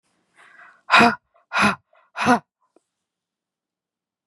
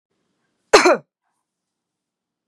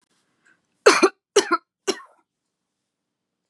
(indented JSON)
{
  "exhalation_length": "4.3 s",
  "exhalation_amplitude": 30443,
  "exhalation_signal_mean_std_ratio": 0.29,
  "cough_length": "2.5 s",
  "cough_amplitude": 32767,
  "cough_signal_mean_std_ratio": 0.23,
  "three_cough_length": "3.5 s",
  "three_cough_amplitude": 31105,
  "three_cough_signal_mean_std_ratio": 0.25,
  "survey_phase": "beta (2021-08-13 to 2022-03-07)",
  "age": "45-64",
  "gender": "Female",
  "wearing_mask": "No",
  "symptom_none": true,
  "symptom_onset": "12 days",
  "smoker_status": "Never smoked",
  "respiratory_condition_asthma": false,
  "respiratory_condition_other": false,
  "recruitment_source": "REACT",
  "submission_delay": "3 days",
  "covid_test_result": "Negative",
  "covid_test_method": "RT-qPCR",
  "influenza_a_test_result": "Negative",
  "influenza_b_test_result": "Negative"
}